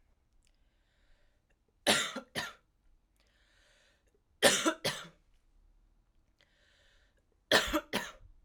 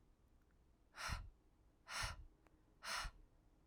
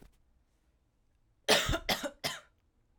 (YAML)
three_cough_length: 8.4 s
three_cough_amplitude: 14512
three_cough_signal_mean_std_ratio: 0.28
exhalation_length: 3.7 s
exhalation_amplitude: 875
exhalation_signal_mean_std_ratio: 0.48
cough_length: 3.0 s
cough_amplitude: 12096
cough_signal_mean_std_ratio: 0.34
survey_phase: alpha (2021-03-01 to 2021-08-12)
age: 18-44
gender: Female
wearing_mask: 'No'
symptom_new_continuous_cough: true
symptom_fatigue: true
symptom_fever_high_temperature: true
symptom_headache: true
symptom_change_to_sense_of_smell_or_taste: true
smoker_status: Never smoked
respiratory_condition_asthma: false
respiratory_condition_other: false
recruitment_source: Test and Trace
submission_delay: 1 day
covid_test_result: Positive
covid_test_method: RT-qPCR
covid_ct_value: 21.3
covid_ct_gene: ORF1ab gene
covid_ct_mean: 22.5
covid_viral_load: 42000 copies/ml
covid_viral_load_category: Low viral load (10K-1M copies/ml)